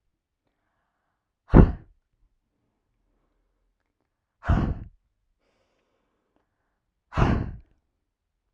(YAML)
exhalation_length: 8.5 s
exhalation_amplitude: 30147
exhalation_signal_mean_std_ratio: 0.2
survey_phase: alpha (2021-03-01 to 2021-08-12)
age: 18-44
gender: Female
wearing_mask: 'No'
symptom_fatigue: true
symptom_headache: true
symptom_onset: 13 days
smoker_status: Never smoked
respiratory_condition_asthma: true
respiratory_condition_other: false
recruitment_source: REACT
submission_delay: 1 day
covid_test_result: Negative
covid_test_method: RT-qPCR